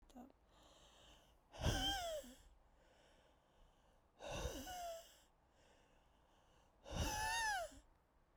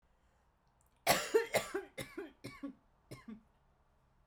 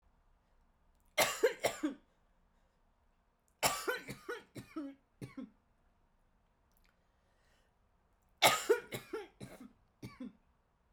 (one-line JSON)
{"exhalation_length": "8.4 s", "exhalation_amplitude": 1798, "exhalation_signal_mean_std_ratio": 0.48, "cough_length": "4.3 s", "cough_amplitude": 5885, "cough_signal_mean_std_ratio": 0.33, "three_cough_length": "10.9 s", "three_cough_amplitude": 7524, "three_cough_signal_mean_std_ratio": 0.29, "survey_phase": "alpha (2021-03-01 to 2021-08-12)", "age": "18-44", "gender": "Female", "wearing_mask": "No", "symptom_cough_any": true, "symptom_shortness_of_breath": true, "symptom_fatigue": true, "symptom_fever_high_temperature": true, "symptom_headache": true, "symptom_change_to_sense_of_smell_or_taste": true, "symptom_loss_of_taste": true, "symptom_onset": "6 days", "smoker_status": "Never smoked", "respiratory_condition_asthma": false, "respiratory_condition_other": false, "recruitment_source": "Test and Trace", "submission_delay": "1 day", "covid_test_result": "Positive", "covid_test_method": "RT-qPCR"}